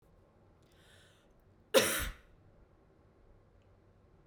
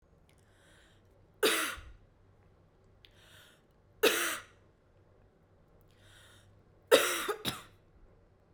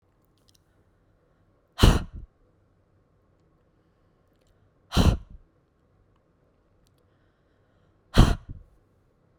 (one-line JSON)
{"cough_length": "4.3 s", "cough_amplitude": 8203, "cough_signal_mean_std_ratio": 0.24, "three_cough_length": "8.5 s", "three_cough_amplitude": 13514, "three_cough_signal_mean_std_ratio": 0.29, "exhalation_length": "9.4 s", "exhalation_amplitude": 26597, "exhalation_signal_mean_std_ratio": 0.21, "survey_phase": "beta (2021-08-13 to 2022-03-07)", "age": "18-44", "gender": "Female", "wearing_mask": "No", "symptom_runny_or_blocked_nose": true, "symptom_sore_throat": true, "symptom_fatigue": true, "symptom_headache": true, "symptom_change_to_sense_of_smell_or_taste": true, "smoker_status": "Current smoker (1 to 10 cigarettes per day)", "respiratory_condition_asthma": false, "respiratory_condition_other": false, "recruitment_source": "Test and Trace", "submission_delay": "1 day", "covid_test_result": "Positive", "covid_test_method": "RT-qPCR", "covid_ct_value": 17.8, "covid_ct_gene": "ORF1ab gene", "covid_ct_mean": 18.2, "covid_viral_load": "1100000 copies/ml", "covid_viral_load_category": "High viral load (>1M copies/ml)"}